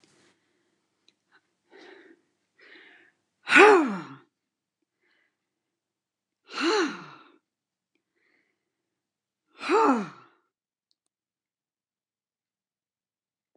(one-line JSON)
{"exhalation_length": "13.6 s", "exhalation_amplitude": 23210, "exhalation_signal_mean_std_ratio": 0.22, "survey_phase": "beta (2021-08-13 to 2022-03-07)", "age": "65+", "gender": "Female", "wearing_mask": "No", "symptom_none": true, "smoker_status": "Ex-smoker", "respiratory_condition_asthma": false, "respiratory_condition_other": false, "recruitment_source": "REACT", "submission_delay": "1 day", "covid_test_result": "Negative", "covid_test_method": "RT-qPCR"}